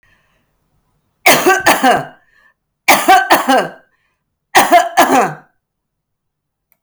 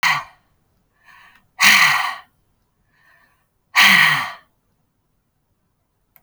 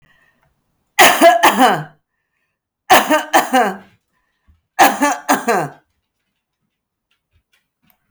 {
  "cough_length": "6.8 s",
  "cough_amplitude": 32768,
  "cough_signal_mean_std_ratio": 0.46,
  "exhalation_length": "6.2 s",
  "exhalation_amplitude": 32767,
  "exhalation_signal_mean_std_ratio": 0.35,
  "three_cough_length": "8.1 s",
  "three_cough_amplitude": 32768,
  "three_cough_signal_mean_std_ratio": 0.4,
  "survey_phase": "alpha (2021-03-01 to 2021-08-12)",
  "age": "65+",
  "gender": "Female",
  "wearing_mask": "No",
  "symptom_none": true,
  "smoker_status": "Never smoked",
  "respiratory_condition_asthma": false,
  "respiratory_condition_other": false,
  "recruitment_source": "REACT",
  "submission_delay": "2 days",
  "covid_test_result": "Negative",
  "covid_test_method": "RT-qPCR"
}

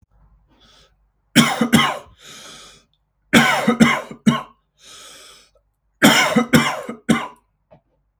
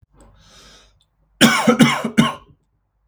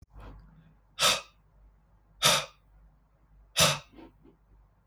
{
  "three_cough_length": "8.2 s",
  "three_cough_amplitude": 32768,
  "three_cough_signal_mean_std_ratio": 0.41,
  "cough_length": "3.1 s",
  "cough_amplitude": 32768,
  "cough_signal_mean_std_ratio": 0.39,
  "exhalation_length": "4.9 s",
  "exhalation_amplitude": 16487,
  "exhalation_signal_mean_std_ratio": 0.31,
  "survey_phase": "beta (2021-08-13 to 2022-03-07)",
  "age": "18-44",
  "gender": "Male",
  "wearing_mask": "No",
  "symptom_none": true,
  "smoker_status": "Never smoked",
  "respiratory_condition_asthma": false,
  "respiratory_condition_other": false,
  "recruitment_source": "REACT",
  "submission_delay": "1 day",
  "covid_test_result": "Negative",
  "covid_test_method": "RT-qPCR",
  "influenza_a_test_result": "Negative",
  "influenza_b_test_result": "Negative"
}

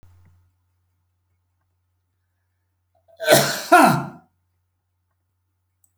{
  "cough_length": "6.0 s",
  "cough_amplitude": 30622,
  "cough_signal_mean_std_ratio": 0.25,
  "survey_phase": "beta (2021-08-13 to 2022-03-07)",
  "age": "65+",
  "gender": "Male",
  "wearing_mask": "No",
  "symptom_none": true,
  "smoker_status": "Never smoked",
  "respiratory_condition_asthma": false,
  "respiratory_condition_other": false,
  "recruitment_source": "REACT",
  "submission_delay": "1 day",
  "covid_test_result": "Negative",
  "covid_test_method": "RT-qPCR"
}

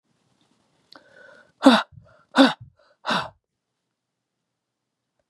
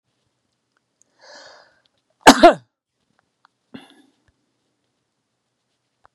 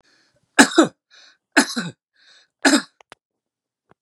{
  "exhalation_length": "5.3 s",
  "exhalation_amplitude": 30427,
  "exhalation_signal_mean_std_ratio": 0.23,
  "cough_length": "6.1 s",
  "cough_amplitude": 32768,
  "cough_signal_mean_std_ratio": 0.15,
  "three_cough_length": "4.0 s",
  "three_cough_amplitude": 32768,
  "three_cough_signal_mean_std_ratio": 0.28,
  "survey_phase": "beta (2021-08-13 to 2022-03-07)",
  "age": "65+",
  "gender": "Male",
  "wearing_mask": "No",
  "symptom_none": true,
  "smoker_status": "Ex-smoker",
  "respiratory_condition_asthma": false,
  "respiratory_condition_other": false,
  "recruitment_source": "REACT",
  "submission_delay": "2 days",
  "covid_test_result": "Negative",
  "covid_test_method": "RT-qPCR",
  "influenza_a_test_result": "Negative",
  "influenza_b_test_result": "Negative"
}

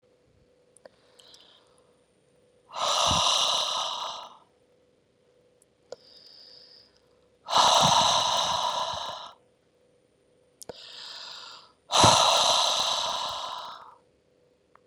{
  "exhalation_length": "14.9 s",
  "exhalation_amplitude": 24207,
  "exhalation_signal_mean_std_ratio": 0.44,
  "survey_phase": "beta (2021-08-13 to 2022-03-07)",
  "age": "45-64",
  "gender": "Female",
  "wearing_mask": "No",
  "symptom_none": true,
  "smoker_status": "Ex-smoker",
  "respiratory_condition_asthma": false,
  "respiratory_condition_other": false,
  "recruitment_source": "REACT",
  "submission_delay": "1 day",
  "covid_test_result": "Negative",
  "covid_test_method": "RT-qPCR",
  "influenza_a_test_result": "Negative",
  "influenza_b_test_result": "Negative"
}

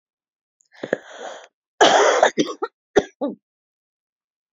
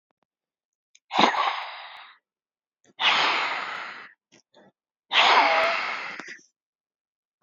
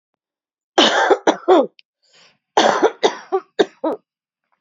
{
  "three_cough_length": "4.5 s",
  "three_cough_amplitude": 27795,
  "three_cough_signal_mean_std_ratio": 0.34,
  "exhalation_length": "7.4 s",
  "exhalation_amplitude": 26521,
  "exhalation_signal_mean_std_ratio": 0.44,
  "cough_length": "4.6 s",
  "cough_amplitude": 29531,
  "cough_signal_mean_std_ratio": 0.42,
  "survey_phase": "beta (2021-08-13 to 2022-03-07)",
  "age": "18-44",
  "gender": "Female",
  "wearing_mask": "Yes",
  "symptom_runny_or_blocked_nose": true,
  "symptom_shortness_of_breath": true,
  "symptom_sore_throat": true,
  "symptom_abdominal_pain": true,
  "symptom_fatigue": true,
  "symptom_headache": true,
  "symptom_loss_of_taste": true,
  "symptom_onset": "8 days",
  "smoker_status": "Current smoker (1 to 10 cigarettes per day)",
  "respiratory_condition_asthma": false,
  "respiratory_condition_other": false,
  "recruitment_source": "Test and Trace",
  "submission_delay": "6 days",
  "covid_test_result": "Positive",
  "covid_test_method": "RT-qPCR",
  "covid_ct_value": 25.6,
  "covid_ct_gene": "N gene"
}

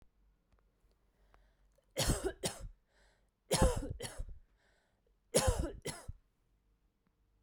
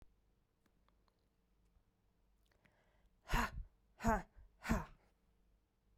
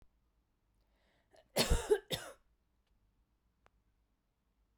{
  "three_cough_length": "7.4 s",
  "three_cough_amplitude": 5917,
  "three_cough_signal_mean_std_ratio": 0.35,
  "exhalation_length": "6.0 s",
  "exhalation_amplitude": 2676,
  "exhalation_signal_mean_std_ratio": 0.27,
  "cough_length": "4.8 s",
  "cough_amplitude": 5187,
  "cough_signal_mean_std_ratio": 0.24,
  "survey_phase": "beta (2021-08-13 to 2022-03-07)",
  "age": "18-44",
  "gender": "Female",
  "wearing_mask": "No",
  "symptom_runny_or_blocked_nose": true,
  "symptom_fatigue": true,
  "symptom_headache": true,
  "symptom_change_to_sense_of_smell_or_taste": true,
  "smoker_status": "Never smoked",
  "respiratory_condition_asthma": false,
  "respiratory_condition_other": false,
  "recruitment_source": "Test and Trace",
  "submission_delay": "2 days",
  "covid_test_result": "Positive",
  "covid_test_method": "LFT"
}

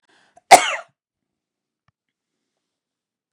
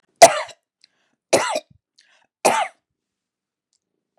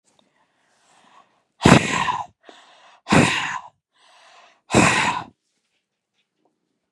{
  "cough_length": "3.3 s",
  "cough_amplitude": 32768,
  "cough_signal_mean_std_ratio": 0.16,
  "three_cough_length": "4.2 s",
  "three_cough_amplitude": 32768,
  "three_cough_signal_mean_std_ratio": 0.24,
  "exhalation_length": "6.9 s",
  "exhalation_amplitude": 32768,
  "exhalation_signal_mean_std_ratio": 0.33,
  "survey_phase": "beta (2021-08-13 to 2022-03-07)",
  "age": "45-64",
  "gender": "Female",
  "wearing_mask": "No",
  "symptom_none": true,
  "smoker_status": "Ex-smoker",
  "respiratory_condition_asthma": false,
  "respiratory_condition_other": false,
  "recruitment_source": "REACT",
  "submission_delay": "4 days",
  "covid_test_result": "Negative",
  "covid_test_method": "RT-qPCR",
  "influenza_a_test_result": "Negative",
  "influenza_b_test_result": "Negative"
}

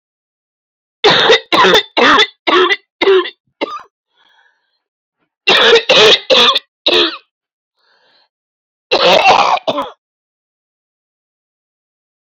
{
  "cough_length": "12.2 s",
  "cough_amplitude": 31426,
  "cough_signal_mean_std_ratio": 0.47,
  "survey_phase": "beta (2021-08-13 to 2022-03-07)",
  "age": "45-64",
  "gender": "Female",
  "wearing_mask": "No",
  "symptom_cough_any": true,
  "symptom_new_continuous_cough": true,
  "symptom_runny_or_blocked_nose": true,
  "symptom_shortness_of_breath": true,
  "symptom_sore_throat": true,
  "symptom_diarrhoea": true,
  "symptom_fatigue": true,
  "symptom_fever_high_temperature": true,
  "symptom_headache": true,
  "symptom_change_to_sense_of_smell_or_taste": true,
  "symptom_loss_of_taste": true,
  "symptom_other": true,
  "symptom_onset": "4 days",
  "smoker_status": "Ex-smoker",
  "respiratory_condition_asthma": false,
  "respiratory_condition_other": false,
  "recruitment_source": "Test and Trace",
  "submission_delay": "3 days",
  "covid_test_result": "Positive",
  "covid_test_method": "RT-qPCR",
  "covid_ct_value": 16.2,
  "covid_ct_gene": "ORF1ab gene",
  "covid_ct_mean": 16.9,
  "covid_viral_load": "3000000 copies/ml",
  "covid_viral_load_category": "High viral load (>1M copies/ml)"
}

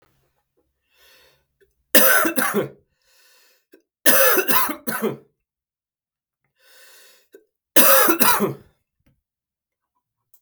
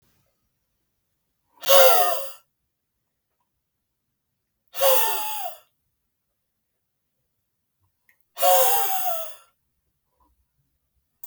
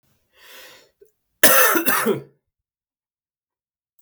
{
  "three_cough_length": "10.4 s",
  "three_cough_amplitude": 32768,
  "three_cough_signal_mean_std_ratio": 0.36,
  "exhalation_length": "11.3 s",
  "exhalation_amplitude": 32217,
  "exhalation_signal_mean_std_ratio": 0.33,
  "cough_length": "4.0 s",
  "cough_amplitude": 32768,
  "cough_signal_mean_std_ratio": 0.33,
  "survey_phase": "beta (2021-08-13 to 2022-03-07)",
  "age": "18-44",
  "gender": "Male",
  "wearing_mask": "No",
  "symptom_none": true,
  "smoker_status": "Never smoked",
  "respiratory_condition_asthma": false,
  "respiratory_condition_other": false,
  "recruitment_source": "REACT",
  "submission_delay": "1 day",
  "covid_test_result": "Negative",
  "covid_test_method": "RT-qPCR"
}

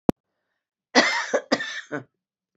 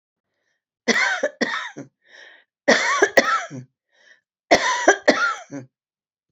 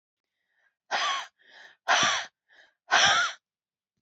{
  "cough_length": "2.6 s",
  "cough_amplitude": 26314,
  "cough_signal_mean_std_ratio": 0.35,
  "three_cough_length": "6.3 s",
  "three_cough_amplitude": 32767,
  "three_cough_signal_mean_std_ratio": 0.43,
  "exhalation_length": "4.0 s",
  "exhalation_amplitude": 12003,
  "exhalation_signal_mean_std_ratio": 0.42,
  "survey_phase": "alpha (2021-03-01 to 2021-08-12)",
  "age": "65+",
  "gender": "Female",
  "wearing_mask": "No",
  "symptom_none": true,
  "smoker_status": "Never smoked",
  "respiratory_condition_asthma": false,
  "respiratory_condition_other": false,
  "recruitment_source": "REACT",
  "submission_delay": "1 day",
  "covid_test_result": "Negative",
  "covid_test_method": "RT-qPCR"
}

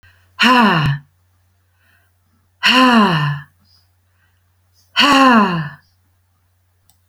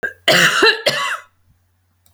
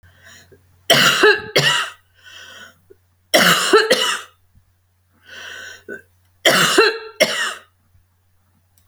{
  "exhalation_length": "7.1 s",
  "exhalation_amplitude": 32296,
  "exhalation_signal_mean_std_ratio": 0.47,
  "cough_length": "2.1 s",
  "cough_amplitude": 31357,
  "cough_signal_mean_std_ratio": 0.52,
  "three_cough_length": "8.9 s",
  "three_cough_amplitude": 32768,
  "three_cough_signal_mean_std_ratio": 0.44,
  "survey_phase": "alpha (2021-03-01 to 2021-08-12)",
  "age": "45-64",
  "gender": "Female",
  "wearing_mask": "No",
  "symptom_none": true,
  "symptom_onset": "10 days",
  "smoker_status": "Ex-smoker",
  "respiratory_condition_asthma": false,
  "respiratory_condition_other": false,
  "recruitment_source": "REACT",
  "submission_delay": "4 days",
  "covid_test_result": "Negative",
  "covid_test_method": "RT-qPCR"
}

